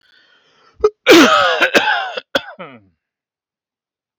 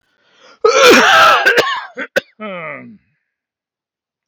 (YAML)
three_cough_length: 4.2 s
three_cough_amplitude: 32768
three_cough_signal_mean_std_ratio: 0.41
cough_length: 4.3 s
cough_amplitude: 32768
cough_signal_mean_std_ratio: 0.49
survey_phase: beta (2021-08-13 to 2022-03-07)
age: 45-64
gender: Male
wearing_mask: 'No'
symptom_none: true
smoker_status: Ex-smoker
respiratory_condition_asthma: false
respiratory_condition_other: false
recruitment_source: REACT
submission_delay: 1 day
covid_test_result: Negative
covid_test_method: RT-qPCR